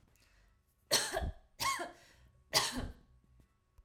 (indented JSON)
{
  "three_cough_length": "3.8 s",
  "three_cough_amplitude": 6311,
  "three_cough_signal_mean_std_ratio": 0.42,
  "survey_phase": "alpha (2021-03-01 to 2021-08-12)",
  "age": "18-44",
  "gender": "Female",
  "wearing_mask": "No",
  "symptom_none": true,
  "smoker_status": "Never smoked",
  "respiratory_condition_asthma": false,
  "respiratory_condition_other": false,
  "recruitment_source": "REACT",
  "submission_delay": "2 days",
  "covid_test_result": "Negative",
  "covid_test_method": "RT-qPCR"
}